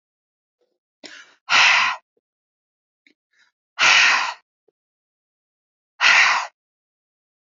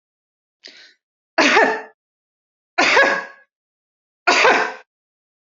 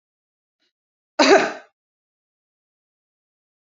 exhalation_length: 7.6 s
exhalation_amplitude: 27693
exhalation_signal_mean_std_ratio: 0.35
three_cough_length: 5.5 s
three_cough_amplitude: 29623
three_cough_signal_mean_std_ratio: 0.4
cough_length: 3.7 s
cough_amplitude: 26285
cough_signal_mean_std_ratio: 0.22
survey_phase: alpha (2021-03-01 to 2021-08-12)
age: 18-44
gender: Female
wearing_mask: 'No'
symptom_none: true
smoker_status: Never smoked
respiratory_condition_asthma: false
respiratory_condition_other: false
recruitment_source: REACT
submission_delay: 2 days
covid_test_result: Negative
covid_test_method: RT-qPCR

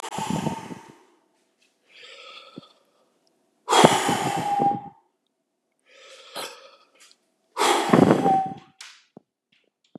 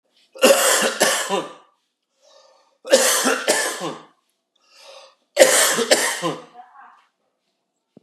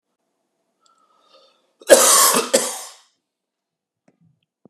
exhalation_length: 10.0 s
exhalation_amplitude: 32768
exhalation_signal_mean_std_ratio: 0.39
three_cough_length: 8.0 s
three_cough_amplitude: 32768
three_cough_signal_mean_std_ratio: 0.46
cough_length: 4.7 s
cough_amplitude: 32768
cough_signal_mean_std_ratio: 0.3
survey_phase: beta (2021-08-13 to 2022-03-07)
age: 18-44
gender: Male
wearing_mask: 'No'
symptom_cough_any: true
symptom_runny_or_blocked_nose: true
symptom_sore_throat: true
symptom_onset: 6 days
smoker_status: Ex-smoker
respiratory_condition_asthma: false
respiratory_condition_other: false
recruitment_source: REACT
submission_delay: 4 days
covid_test_result: Negative
covid_test_method: RT-qPCR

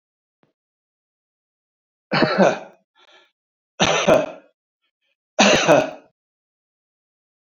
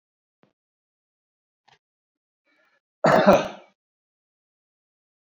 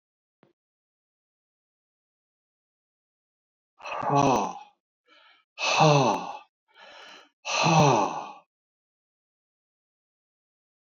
three_cough_length: 7.4 s
three_cough_amplitude: 32260
three_cough_signal_mean_std_ratio: 0.34
cough_length: 5.3 s
cough_amplitude: 26570
cough_signal_mean_std_ratio: 0.21
exhalation_length: 10.8 s
exhalation_amplitude: 15449
exhalation_signal_mean_std_ratio: 0.33
survey_phase: beta (2021-08-13 to 2022-03-07)
age: 65+
gender: Male
wearing_mask: 'No'
symptom_none: true
smoker_status: Never smoked
respiratory_condition_asthma: false
respiratory_condition_other: false
recruitment_source: REACT
submission_delay: 2 days
covid_test_result: Negative
covid_test_method: RT-qPCR
influenza_a_test_result: Negative
influenza_b_test_result: Negative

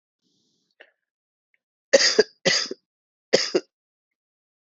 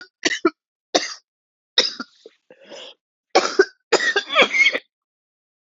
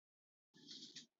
three_cough_length: 4.7 s
three_cough_amplitude: 27205
three_cough_signal_mean_std_ratio: 0.27
cough_length: 5.6 s
cough_amplitude: 32768
cough_signal_mean_std_ratio: 0.37
exhalation_length: 1.2 s
exhalation_amplitude: 274
exhalation_signal_mean_std_ratio: 0.5
survey_phase: beta (2021-08-13 to 2022-03-07)
age: 18-44
gender: Female
wearing_mask: 'No'
symptom_cough_any: true
symptom_shortness_of_breath: true
symptom_sore_throat: true
symptom_headache: true
symptom_onset: 4 days
smoker_status: Ex-smoker
respiratory_condition_asthma: true
respiratory_condition_other: false
recruitment_source: Test and Trace
submission_delay: 2 days
covid_test_result: Positive
covid_test_method: RT-qPCR
covid_ct_value: 24.7
covid_ct_gene: N gene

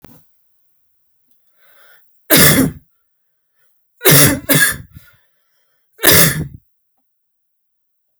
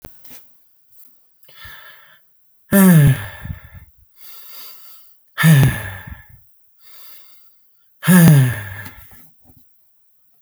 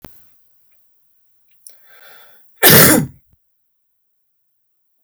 three_cough_length: 8.2 s
three_cough_amplitude: 32768
three_cough_signal_mean_std_ratio: 0.34
exhalation_length: 10.4 s
exhalation_amplitude: 32768
exhalation_signal_mean_std_ratio: 0.37
cough_length: 5.0 s
cough_amplitude: 32768
cough_signal_mean_std_ratio: 0.26
survey_phase: alpha (2021-03-01 to 2021-08-12)
age: 18-44
gender: Male
wearing_mask: 'No'
symptom_none: true
smoker_status: Never smoked
respiratory_condition_asthma: false
respiratory_condition_other: false
recruitment_source: REACT
submission_delay: 2 days
covid_test_result: Negative
covid_test_method: RT-qPCR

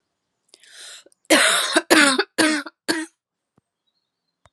cough_length: 4.5 s
cough_amplitude: 32767
cough_signal_mean_std_ratio: 0.4
survey_phase: alpha (2021-03-01 to 2021-08-12)
age: 18-44
gender: Female
wearing_mask: 'No'
symptom_cough_any: true
symptom_fatigue: true
symptom_headache: true
smoker_status: Never smoked
respiratory_condition_asthma: false
respiratory_condition_other: false
recruitment_source: Test and Trace
submission_delay: 2 days
covid_test_result: Positive
covid_test_method: RT-qPCR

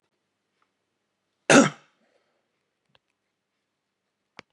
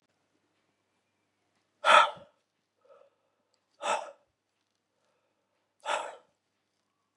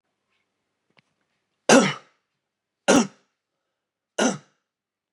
cough_length: 4.5 s
cough_amplitude: 27568
cough_signal_mean_std_ratio: 0.16
exhalation_length: 7.2 s
exhalation_amplitude: 15710
exhalation_signal_mean_std_ratio: 0.2
three_cough_length: 5.1 s
three_cough_amplitude: 26284
three_cough_signal_mean_std_ratio: 0.25
survey_phase: beta (2021-08-13 to 2022-03-07)
age: 45-64
gender: Male
wearing_mask: 'No'
symptom_cough_any: true
symptom_onset: 2 days
smoker_status: Never smoked
respiratory_condition_asthma: false
respiratory_condition_other: false
recruitment_source: Test and Trace
submission_delay: 1 day
covid_test_result: Positive
covid_test_method: RT-qPCR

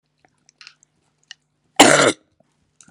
cough_length: 2.9 s
cough_amplitude: 32768
cough_signal_mean_std_ratio: 0.26
survey_phase: beta (2021-08-13 to 2022-03-07)
age: 45-64
gender: Female
wearing_mask: 'No'
symptom_cough_any: true
symptom_sore_throat: true
symptom_fatigue: true
symptom_headache: true
symptom_other: true
symptom_onset: 3 days
smoker_status: Never smoked
respiratory_condition_asthma: false
respiratory_condition_other: false
recruitment_source: Test and Trace
submission_delay: 1 day
covid_test_result: Positive
covid_test_method: RT-qPCR
covid_ct_value: 22.5
covid_ct_gene: N gene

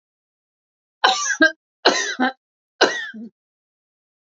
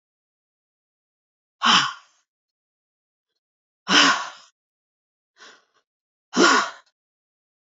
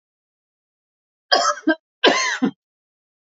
three_cough_length: 4.3 s
three_cough_amplitude: 29411
three_cough_signal_mean_std_ratio: 0.36
exhalation_length: 7.8 s
exhalation_amplitude: 25272
exhalation_signal_mean_std_ratio: 0.28
cough_length: 3.2 s
cough_amplitude: 31396
cough_signal_mean_std_ratio: 0.37
survey_phase: beta (2021-08-13 to 2022-03-07)
age: 65+
gender: Female
wearing_mask: 'No'
symptom_none: true
symptom_onset: 2 days
smoker_status: Never smoked
respiratory_condition_asthma: false
respiratory_condition_other: false
recruitment_source: REACT
submission_delay: 1 day
covid_test_result: Negative
covid_test_method: RT-qPCR
influenza_a_test_result: Negative
influenza_b_test_result: Negative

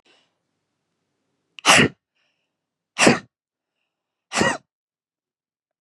exhalation_length: 5.8 s
exhalation_amplitude: 32108
exhalation_signal_mean_std_ratio: 0.25
survey_phase: beta (2021-08-13 to 2022-03-07)
age: 45-64
gender: Female
wearing_mask: 'No'
symptom_cough_any: true
symptom_runny_or_blocked_nose: true
symptom_onset: 12 days
smoker_status: Ex-smoker
respiratory_condition_asthma: false
respiratory_condition_other: false
recruitment_source: REACT
submission_delay: 1 day
covid_test_result: Negative
covid_test_method: RT-qPCR
influenza_a_test_result: Negative
influenza_b_test_result: Negative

